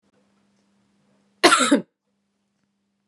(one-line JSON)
{"cough_length": "3.1 s", "cough_amplitude": 32767, "cough_signal_mean_std_ratio": 0.26, "survey_phase": "beta (2021-08-13 to 2022-03-07)", "age": "18-44", "gender": "Female", "wearing_mask": "No", "symptom_runny_or_blocked_nose": true, "symptom_sore_throat": true, "symptom_other": true, "symptom_onset": "8 days", "smoker_status": "Never smoked", "respiratory_condition_asthma": false, "respiratory_condition_other": false, "recruitment_source": "Test and Trace", "submission_delay": "2 days", "covid_test_result": "Positive", "covid_test_method": "RT-qPCR", "covid_ct_value": 17.3, "covid_ct_gene": "ORF1ab gene", "covid_ct_mean": 17.5, "covid_viral_load": "1800000 copies/ml", "covid_viral_load_category": "High viral load (>1M copies/ml)"}